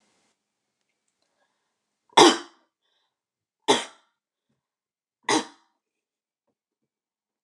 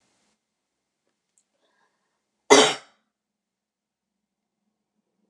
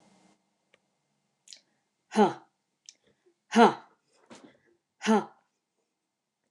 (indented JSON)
{
  "three_cough_length": "7.4 s",
  "three_cough_amplitude": 28523,
  "three_cough_signal_mean_std_ratio": 0.18,
  "cough_length": "5.3 s",
  "cough_amplitude": 28388,
  "cough_signal_mean_std_ratio": 0.16,
  "exhalation_length": "6.5 s",
  "exhalation_amplitude": 17401,
  "exhalation_signal_mean_std_ratio": 0.22,
  "survey_phase": "beta (2021-08-13 to 2022-03-07)",
  "age": "45-64",
  "gender": "Female",
  "wearing_mask": "No",
  "symptom_none": true,
  "smoker_status": "Never smoked",
  "respiratory_condition_asthma": false,
  "respiratory_condition_other": false,
  "recruitment_source": "REACT",
  "submission_delay": "1 day",
  "covid_test_result": "Negative",
  "covid_test_method": "RT-qPCR",
  "influenza_a_test_result": "Negative",
  "influenza_b_test_result": "Negative"
}